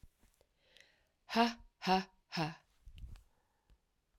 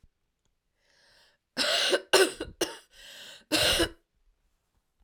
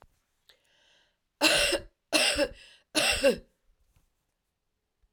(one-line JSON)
{"exhalation_length": "4.2 s", "exhalation_amplitude": 4609, "exhalation_signal_mean_std_ratio": 0.31, "cough_length": "5.0 s", "cough_amplitude": 16813, "cough_signal_mean_std_ratio": 0.38, "three_cough_length": "5.1 s", "three_cough_amplitude": 13404, "three_cough_signal_mean_std_ratio": 0.39, "survey_phase": "alpha (2021-03-01 to 2021-08-12)", "age": "45-64", "gender": "Female", "wearing_mask": "No", "symptom_cough_any": true, "symptom_change_to_sense_of_smell_or_taste": true, "symptom_onset": "5 days", "smoker_status": "Ex-smoker", "respiratory_condition_asthma": false, "respiratory_condition_other": false, "recruitment_source": "Test and Trace", "submission_delay": "2 days", "covid_test_result": "Positive", "covid_test_method": "RT-qPCR", "covid_ct_value": 12.0, "covid_ct_gene": "ORF1ab gene", "covid_ct_mean": 12.6, "covid_viral_load": "74000000 copies/ml", "covid_viral_load_category": "High viral load (>1M copies/ml)"}